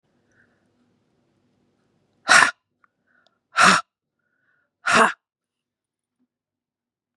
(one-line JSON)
{"exhalation_length": "7.2 s", "exhalation_amplitude": 32741, "exhalation_signal_mean_std_ratio": 0.24, "survey_phase": "beta (2021-08-13 to 2022-03-07)", "age": "45-64", "gender": "Female", "wearing_mask": "No", "symptom_cough_any": true, "symptom_runny_or_blocked_nose": true, "symptom_sore_throat": true, "smoker_status": "Ex-smoker", "respiratory_condition_asthma": false, "respiratory_condition_other": false, "recruitment_source": "Test and Trace", "submission_delay": "2 days", "covid_test_result": "Positive", "covid_test_method": "LFT"}